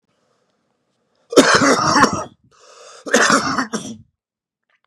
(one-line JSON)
{"cough_length": "4.9 s", "cough_amplitude": 32768, "cough_signal_mean_std_ratio": 0.44, "survey_phase": "beta (2021-08-13 to 2022-03-07)", "age": "18-44", "gender": "Male", "wearing_mask": "No", "symptom_cough_any": true, "symptom_runny_or_blocked_nose": true, "symptom_sore_throat": true, "symptom_abdominal_pain": true, "symptom_diarrhoea": true, "symptom_fatigue": true, "symptom_change_to_sense_of_smell_or_taste": true, "symptom_other": true, "symptom_onset": "4 days", "smoker_status": "Current smoker (11 or more cigarettes per day)", "respiratory_condition_asthma": false, "respiratory_condition_other": false, "recruitment_source": "Test and Trace", "submission_delay": "1 day", "covid_test_result": "Positive", "covid_test_method": "RT-qPCR", "covid_ct_value": 31.2, "covid_ct_gene": "N gene"}